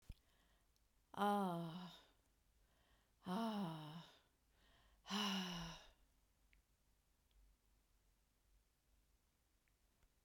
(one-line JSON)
{"exhalation_length": "10.2 s", "exhalation_amplitude": 1271, "exhalation_signal_mean_std_ratio": 0.39, "survey_phase": "beta (2021-08-13 to 2022-03-07)", "age": "65+", "gender": "Female", "wearing_mask": "No", "symptom_none": true, "smoker_status": "Never smoked", "respiratory_condition_asthma": false, "respiratory_condition_other": false, "recruitment_source": "REACT", "submission_delay": "2 days", "covid_test_result": "Negative", "covid_test_method": "RT-qPCR", "influenza_a_test_result": "Negative", "influenza_b_test_result": "Negative"}